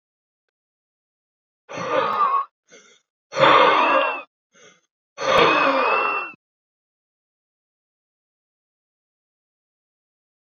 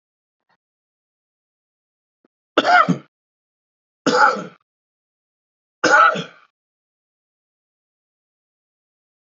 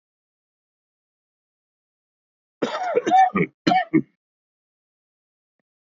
{
  "exhalation_length": "10.5 s",
  "exhalation_amplitude": 26212,
  "exhalation_signal_mean_std_ratio": 0.39,
  "three_cough_length": "9.3 s",
  "three_cough_amplitude": 27316,
  "three_cough_signal_mean_std_ratio": 0.26,
  "cough_length": "5.9 s",
  "cough_amplitude": 21815,
  "cough_signal_mean_std_ratio": 0.31,
  "survey_phase": "beta (2021-08-13 to 2022-03-07)",
  "age": "18-44",
  "gender": "Male",
  "wearing_mask": "No",
  "symptom_runny_or_blocked_nose": true,
  "symptom_fatigue": true,
  "symptom_headache": true,
  "symptom_onset": "2 days",
  "smoker_status": "Current smoker (11 or more cigarettes per day)",
  "respiratory_condition_asthma": false,
  "respiratory_condition_other": false,
  "recruitment_source": "Test and Trace",
  "submission_delay": "0 days",
  "covid_test_result": "Positive",
  "covid_test_method": "RT-qPCR",
  "covid_ct_value": 22.6,
  "covid_ct_gene": "N gene",
  "covid_ct_mean": 23.1,
  "covid_viral_load": "27000 copies/ml",
  "covid_viral_load_category": "Low viral load (10K-1M copies/ml)"
}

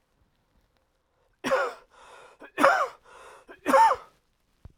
{
  "three_cough_length": "4.8 s",
  "three_cough_amplitude": 26208,
  "three_cough_signal_mean_std_ratio": 0.34,
  "survey_phase": "alpha (2021-03-01 to 2021-08-12)",
  "age": "18-44",
  "gender": "Male",
  "wearing_mask": "No",
  "symptom_fatigue": true,
  "symptom_headache": true,
  "symptom_loss_of_taste": true,
  "symptom_onset": "4 days",
  "smoker_status": "Ex-smoker",
  "respiratory_condition_asthma": false,
  "respiratory_condition_other": false,
  "recruitment_source": "Test and Trace",
  "submission_delay": "2 days",
  "covid_test_result": "Positive",
  "covid_test_method": "RT-qPCR",
  "covid_ct_value": 29.1,
  "covid_ct_gene": "N gene"
}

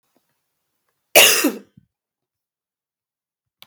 {
  "cough_length": "3.7 s",
  "cough_amplitude": 32766,
  "cough_signal_mean_std_ratio": 0.24,
  "survey_phase": "beta (2021-08-13 to 2022-03-07)",
  "age": "18-44",
  "gender": "Female",
  "wearing_mask": "No",
  "symptom_cough_any": true,
  "symptom_sore_throat": true,
  "symptom_fatigue": true,
  "smoker_status": "Never smoked",
  "respiratory_condition_asthma": false,
  "respiratory_condition_other": false,
  "recruitment_source": "Test and Trace",
  "submission_delay": "2 days",
  "covid_test_result": "Positive",
  "covid_test_method": "ePCR"
}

